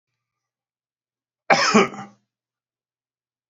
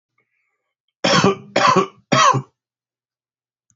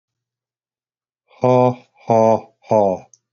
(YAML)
cough_length: 3.5 s
cough_amplitude: 28127
cough_signal_mean_std_ratio: 0.25
three_cough_length: 3.8 s
three_cough_amplitude: 27279
three_cough_signal_mean_std_ratio: 0.4
exhalation_length: 3.3 s
exhalation_amplitude: 29122
exhalation_signal_mean_std_ratio: 0.4
survey_phase: beta (2021-08-13 to 2022-03-07)
age: 45-64
gender: Male
wearing_mask: 'No'
symptom_shortness_of_breath: true
symptom_abdominal_pain: true
symptom_fatigue: true
symptom_headache: true
symptom_change_to_sense_of_smell_or_taste: true
smoker_status: Never smoked
respiratory_condition_asthma: false
respiratory_condition_other: false
recruitment_source: Test and Trace
submission_delay: 2 days
covid_test_result: Positive
covid_test_method: RT-qPCR
covid_ct_value: 28.5
covid_ct_gene: N gene
covid_ct_mean: 30.0
covid_viral_load: 150 copies/ml
covid_viral_load_category: Minimal viral load (< 10K copies/ml)